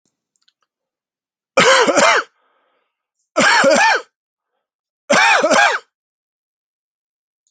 {"three_cough_length": "7.5 s", "three_cough_amplitude": 32768, "three_cough_signal_mean_std_ratio": 0.44, "survey_phase": "alpha (2021-03-01 to 2021-08-12)", "age": "45-64", "gender": "Male", "wearing_mask": "No", "symptom_none": true, "smoker_status": "Never smoked", "respiratory_condition_asthma": false, "respiratory_condition_other": false, "recruitment_source": "Test and Trace", "submission_delay": "1 day", "covid_test_result": "Positive", "covid_test_method": "RT-qPCR"}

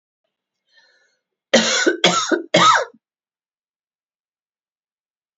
{"cough_length": "5.4 s", "cough_amplitude": 30053, "cough_signal_mean_std_ratio": 0.35, "survey_phase": "beta (2021-08-13 to 2022-03-07)", "age": "45-64", "gender": "Female", "wearing_mask": "No", "symptom_cough_any": true, "symptom_runny_or_blocked_nose": true, "symptom_sore_throat": true, "symptom_fatigue": true, "symptom_headache": true, "symptom_onset": "2 days", "smoker_status": "Ex-smoker", "respiratory_condition_asthma": false, "respiratory_condition_other": false, "recruitment_source": "Test and Trace", "submission_delay": "1 day", "covid_test_result": "Positive", "covid_test_method": "RT-qPCR", "covid_ct_value": 30.0, "covid_ct_gene": "ORF1ab gene"}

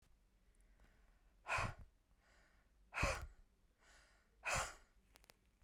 {"exhalation_length": "5.6 s", "exhalation_amplitude": 1837, "exhalation_signal_mean_std_ratio": 0.36, "survey_phase": "beta (2021-08-13 to 2022-03-07)", "age": "45-64", "gender": "Female", "wearing_mask": "No", "symptom_none": true, "smoker_status": "Never smoked", "respiratory_condition_asthma": false, "respiratory_condition_other": false, "recruitment_source": "REACT", "submission_delay": "1 day", "covid_test_result": "Negative", "covid_test_method": "RT-qPCR", "influenza_a_test_result": "Negative", "influenza_b_test_result": "Negative"}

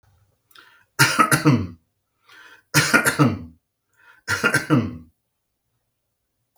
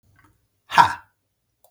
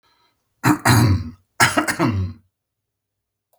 {"three_cough_length": "6.6 s", "three_cough_amplitude": 32151, "three_cough_signal_mean_std_ratio": 0.39, "exhalation_length": "1.7 s", "exhalation_amplitude": 32766, "exhalation_signal_mean_std_ratio": 0.23, "cough_length": "3.6 s", "cough_amplitude": 32768, "cough_signal_mean_std_ratio": 0.46, "survey_phase": "beta (2021-08-13 to 2022-03-07)", "age": "45-64", "gender": "Male", "wearing_mask": "No", "symptom_none": true, "smoker_status": "Never smoked", "respiratory_condition_asthma": false, "respiratory_condition_other": false, "recruitment_source": "REACT", "submission_delay": "1 day", "covid_test_result": "Negative", "covid_test_method": "RT-qPCR", "influenza_a_test_result": "Negative", "influenza_b_test_result": "Negative"}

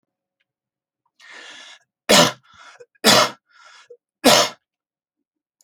{"three_cough_length": "5.6 s", "three_cough_amplitude": 32768, "three_cough_signal_mean_std_ratio": 0.29, "survey_phase": "alpha (2021-03-01 to 2021-08-12)", "age": "65+", "gender": "Male", "wearing_mask": "No", "symptom_none": true, "smoker_status": "Never smoked", "respiratory_condition_asthma": false, "respiratory_condition_other": false, "recruitment_source": "REACT", "submission_delay": "6 days", "covid_test_result": "Negative", "covid_test_method": "RT-qPCR"}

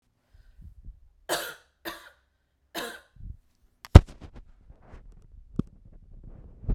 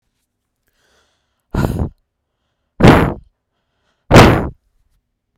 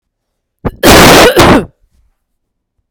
{"three_cough_length": "6.7 s", "three_cough_amplitude": 32768, "three_cough_signal_mean_std_ratio": 0.15, "exhalation_length": "5.4 s", "exhalation_amplitude": 32768, "exhalation_signal_mean_std_ratio": 0.31, "cough_length": "2.9 s", "cough_amplitude": 32768, "cough_signal_mean_std_ratio": 0.53, "survey_phase": "beta (2021-08-13 to 2022-03-07)", "age": "18-44", "gender": "Female", "wearing_mask": "No", "symptom_none": true, "smoker_status": "Never smoked", "respiratory_condition_asthma": false, "respiratory_condition_other": false, "recruitment_source": "REACT", "submission_delay": "18 days", "covid_test_result": "Negative", "covid_test_method": "RT-qPCR"}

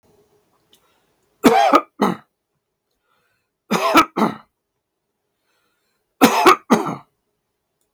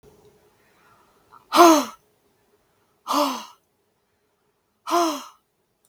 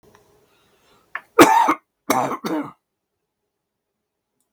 {"three_cough_length": "7.9 s", "three_cough_amplitude": 32768, "three_cough_signal_mean_std_ratio": 0.33, "exhalation_length": "5.9 s", "exhalation_amplitude": 32501, "exhalation_signal_mean_std_ratio": 0.28, "cough_length": "4.5 s", "cough_amplitude": 32768, "cough_signal_mean_std_ratio": 0.3, "survey_phase": "beta (2021-08-13 to 2022-03-07)", "age": "65+", "gender": "Male", "wearing_mask": "No", "symptom_cough_any": true, "smoker_status": "Never smoked", "respiratory_condition_asthma": false, "respiratory_condition_other": false, "recruitment_source": "REACT", "submission_delay": "1 day", "covid_test_result": "Negative", "covid_test_method": "RT-qPCR", "influenza_a_test_result": "Negative", "influenza_b_test_result": "Negative"}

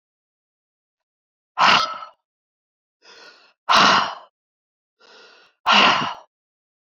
{"exhalation_length": "6.8 s", "exhalation_amplitude": 27826, "exhalation_signal_mean_std_ratio": 0.34, "survey_phase": "beta (2021-08-13 to 2022-03-07)", "age": "65+", "gender": "Male", "wearing_mask": "No", "symptom_none": true, "smoker_status": "Ex-smoker", "respiratory_condition_asthma": false, "respiratory_condition_other": false, "recruitment_source": "REACT", "submission_delay": "3 days", "covid_test_result": "Negative", "covid_test_method": "RT-qPCR", "influenza_a_test_result": "Negative", "influenza_b_test_result": "Negative"}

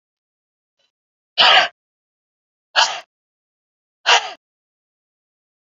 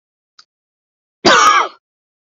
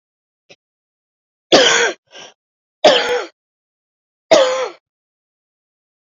{"exhalation_length": "5.6 s", "exhalation_amplitude": 32767, "exhalation_signal_mean_std_ratio": 0.26, "cough_length": "2.3 s", "cough_amplitude": 31546, "cough_signal_mean_std_ratio": 0.37, "three_cough_length": "6.1 s", "three_cough_amplitude": 32768, "three_cough_signal_mean_std_ratio": 0.34, "survey_phase": "beta (2021-08-13 to 2022-03-07)", "age": "18-44", "gender": "Female", "wearing_mask": "No", "symptom_new_continuous_cough": true, "symptom_runny_or_blocked_nose": true, "symptom_sore_throat": true, "symptom_abdominal_pain": true, "symptom_fatigue": true, "symptom_headache": true, "symptom_onset": "2 days", "smoker_status": "Ex-smoker", "respiratory_condition_asthma": false, "respiratory_condition_other": false, "recruitment_source": "Test and Trace", "submission_delay": "2 days", "covid_test_result": "Positive", "covid_test_method": "RT-qPCR", "covid_ct_value": 22.4, "covid_ct_gene": "N gene"}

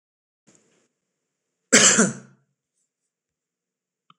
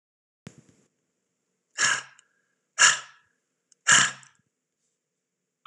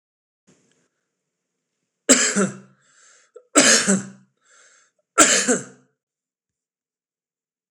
{"cough_length": "4.2 s", "cough_amplitude": 26028, "cough_signal_mean_std_ratio": 0.24, "exhalation_length": "5.7 s", "exhalation_amplitude": 24647, "exhalation_signal_mean_std_ratio": 0.25, "three_cough_length": "7.7 s", "three_cough_amplitude": 26028, "three_cough_signal_mean_std_ratio": 0.31, "survey_phase": "beta (2021-08-13 to 2022-03-07)", "age": "45-64", "gender": "Male", "wearing_mask": "No", "symptom_none": true, "smoker_status": "Never smoked", "respiratory_condition_asthma": false, "respiratory_condition_other": false, "recruitment_source": "REACT", "submission_delay": "3 days", "covid_test_result": "Negative", "covid_test_method": "RT-qPCR", "influenza_a_test_result": "Negative", "influenza_b_test_result": "Negative"}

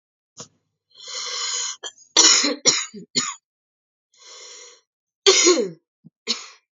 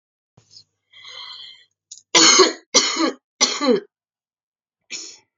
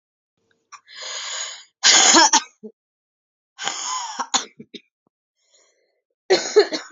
{"cough_length": "6.7 s", "cough_amplitude": 30331, "cough_signal_mean_std_ratio": 0.39, "three_cough_length": "5.4 s", "three_cough_amplitude": 32414, "three_cough_signal_mean_std_ratio": 0.36, "exhalation_length": "6.9 s", "exhalation_amplitude": 32768, "exhalation_signal_mean_std_ratio": 0.36, "survey_phase": "beta (2021-08-13 to 2022-03-07)", "age": "18-44", "gender": "Female", "wearing_mask": "No", "symptom_cough_any": true, "symptom_runny_or_blocked_nose": true, "symptom_shortness_of_breath": true, "symptom_diarrhoea": true, "symptom_fatigue": true, "symptom_headache": true, "symptom_change_to_sense_of_smell_or_taste": true, "symptom_onset": "3 days", "smoker_status": "Ex-smoker", "respiratory_condition_asthma": true, "respiratory_condition_other": false, "recruitment_source": "Test and Trace", "submission_delay": "1 day", "covid_test_result": "Positive", "covid_test_method": "ePCR"}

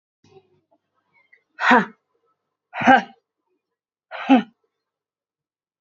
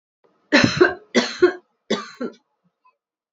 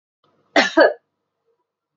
{"exhalation_length": "5.8 s", "exhalation_amplitude": 32767, "exhalation_signal_mean_std_ratio": 0.25, "three_cough_length": "3.3 s", "three_cough_amplitude": 26855, "three_cough_signal_mean_std_ratio": 0.36, "cough_length": "2.0 s", "cough_amplitude": 27481, "cough_signal_mean_std_ratio": 0.3, "survey_phase": "beta (2021-08-13 to 2022-03-07)", "age": "45-64", "gender": "Female", "wearing_mask": "No", "symptom_cough_any": true, "symptom_runny_or_blocked_nose": true, "symptom_shortness_of_breath": true, "symptom_sore_throat": true, "symptom_abdominal_pain": true, "symptom_diarrhoea": true, "symptom_fatigue": true, "symptom_fever_high_temperature": true, "symptom_headache": true, "symptom_onset": "3 days", "smoker_status": "Ex-smoker", "respiratory_condition_asthma": false, "respiratory_condition_other": false, "recruitment_source": "Test and Trace", "submission_delay": "2 days", "covid_test_result": "Positive", "covid_test_method": "RT-qPCR", "covid_ct_value": 23.4, "covid_ct_gene": "ORF1ab gene", "covid_ct_mean": 23.7, "covid_viral_load": "17000 copies/ml", "covid_viral_load_category": "Low viral load (10K-1M copies/ml)"}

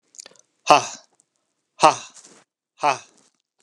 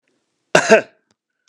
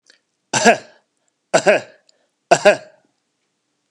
{"exhalation_length": "3.6 s", "exhalation_amplitude": 32768, "exhalation_signal_mean_std_ratio": 0.24, "cough_length": "1.5 s", "cough_amplitude": 32768, "cough_signal_mean_std_ratio": 0.29, "three_cough_length": "3.9 s", "three_cough_amplitude": 32768, "three_cough_signal_mean_std_ratio": 0.3, "survey_phase": "beta (2021-08-13 to 2022-03-07)", "age": "65+", "gender": "Male", "wearing_mask": "No", "symptom_none": true, "smoker_status": "Ex-smoker", "respiratory_condition_asthma": false, "respiratory_condition_other": false, "recruitment_source": "REACT", "submission_delay": "2 days", "covid_test_result": "Negative", "covid_test_method": "RT-qPCR", "influenza_a_test_result": "Negative", "influenza_b_test_result": "Negative"}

